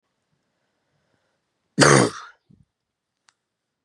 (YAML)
cough_length: 3.8 s
cough_amplitude: 31178
cough_signal_mean_std_ratio: 0.23
survey_phase: beta (2021-08-13 to 2022-03-07)
age: 18-44
gender: Female
wearing_mask: 'No'
symptom_cough_any: true
symptom_new_continuous_cough: true
symptom_runny_or_blocked_nose: true
symptom_sore_throat: true
symptom_fatigue: true
symptom_headache: true
symptom_change_to_sense_of_smell_or_taste: true
smoker_status: Never smoked
respiratory_condition_asthma: true
respiratory_condition_other: false
recruitment_source: Test and Trace
submission_delay: 12 days
covid_test_result: Negative
covid_test_method: RT-qPCR